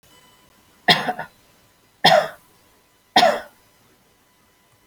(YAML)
three_cough_length: 4.9 s
three_cough_amplitude: 32344
three_cough_signal_mean_std_ratio: 0.3
survey_phase: beta (2021-08-13 to 2022-03-07)
age: 65+
gender: Female
wearing_mask: 'No'
symptom_none: true
smoker_status: Ex-smoker
respiratory_condition_asthma: false
respiratory_condition_other: false
recruitment_source: Test and Trace
submission_delay: 0 days
covid_test_result: Negative
covid_test_method: LFT